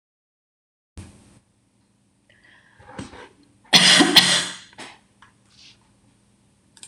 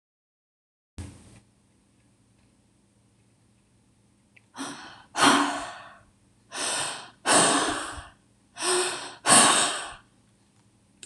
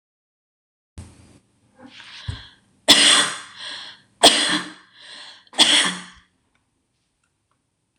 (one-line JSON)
{"cough_length": "6.9 s", "cough_amplitude": 26028, "cough_signal_mean_std_ratio": 0.27, "exhalation_length": "11.1 s", "exhalation_amplitude": 23269, "exhalation_signal_mean_std_ratio": 0.38, "three_cough_length": "8.0 s", "three_cough_amplitude": 26028, "three_cough_signal_mean_std_ratio": 0.32, "survey_phase": "beta (2021-08-13 to 2022-03-07)", "age": "45-64", "gender": "Female", "wearing_mask": "No", "symptom_none": true, "smoker_status": "Never smoked", "respiratory_condition_asthma": false, "respiratory_condition_other": false, "recruitment_source": "REACT", "submission_delay": "1 day", "covid_test_result": "Negative", "covid_test_method": "RT-qPCR"}